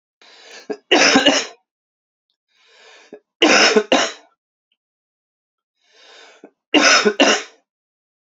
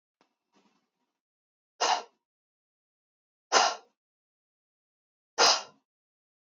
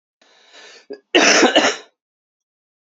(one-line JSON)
{"three_cough_length": "8.4 s", "three_cough_amplitude": 32768, "three_cough_signal_mean_std_ratio": 0.37, "exhalation_length": "6.5 s", "exhalation_amplitude": 14191, "exhalation_signal_mean_std_ratio": 0.23, "cough_length": "3.0 s", "cough_amplitude": 28802, "cough_signal_mean_std_ratio": 0.37, "survey_phase": "beta (2021-08-13 to 2022-03-07)", "age": "18-44", "gender": "Male", "wearing_mask": "No", "symptom_cough_any": true, "symptom_runny_or_blocked_nose": true, "symptom_sore_throat": true, "symptom_fatigue": true, "symptom_fever_high_temperature": true, "symptom_headache": true, "symptom_change_to_sense_of_smell_or_taste": true, "symptom_loss_of_taste": true, "smoker_status": "Never smoked", "respiratory_condition_asthma": false, "respiratory_condition_other": false, "recruitment_source": "Test and Trace", "submission_delay": "2 days", "covid_test_result": "Positive", "covid_test_method": "ePCR"}